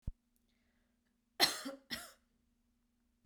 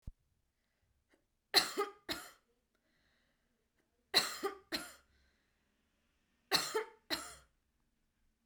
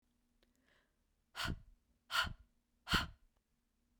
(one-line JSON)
{"cough_length": "3.3 s", "cough_amplitude": 7236, "cough_signal_mean_std_ratio": 0.23, "three_cough_length": "8.5 s", "three_cough_amplitude": 7815, "three_cough_signal_mean_std_ratio": 0.27, "exhalation_length": "4.0 s", "exhalation_amplitude": 3431, "exhalation_signal_mean_std_ratio": 0.3, "survey_phase": "beta (2021-08-13 to 2022-03-07)", "age": "18-44", "gender": "Female", "wearing_mask": "No", "symptom_cough_any": true, "symptom_runny_or_blocked_nose": true, "symptom_headache": true, "symptom_onset": "7 days", "smoker_status": "Ex-smoker", "respiratory_condition_asthma": false, "respiratory_condition_other": false, "recruitment_source": "Test and Trace", "submission_delay": "2 days", "covid_test_result": "Positive", "covid_test_method": "RT-qPCR", "covid_ct_value": 18.6, "covid_ct_gene": "ORF1ab gene"}